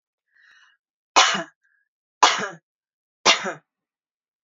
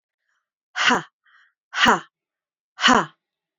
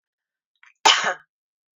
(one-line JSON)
{"three_cough_length": "4.4 s", "three_cough_amplitude": 29419, "three_cough_signal_mean_std_ratio": 0.28, "exhalation_length": "3.6 s", "exhalation_amplitude": 26892, "exhalation_signal_mean_std_ratio": 0.34, "cough_length": "1.8 s", "cough_amplitude": 29719, "cough_signal_mean_std_ratio": 0.27, "survey_phase": "beta (2021-08-13 to 2022-03-07)", "age": "45-64", "gender": "Female", "wearing_mask": "No", "symptom_runny_or_blocked_nose": true, "symptom_onset": "12 days", "smoker_status": "Never smoked", "respiratory_condition_asthma": false, "respiratory_condition_other": false, "recruitment_source": "REACT", "submission_delay": "2 days", "covid_test_result": "Negative", "covid_test_method": "RT-qPCR", "influenza_a_test_result": "Negative", "influenza_b_test_result": "Negative"}